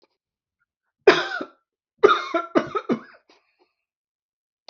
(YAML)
three_cough_length: 4.7 s
three_cough_amplitude: 30639
three_cough_signal_mean_std_ratio: 0.28
survey_phase: beta (2021-08-13 to 2022-03-07)
age: 45-64
gender: Male
wearing_mask: 'No'
symptom_none: true
smoker_status: Ex-smoker
respiratory_condition_asthma: false
respiratory_condition_other: false
recruitment_source: REACT
submission_delay: 3 days
covid_test_result: Negative
covid_test_method: RT-qPCR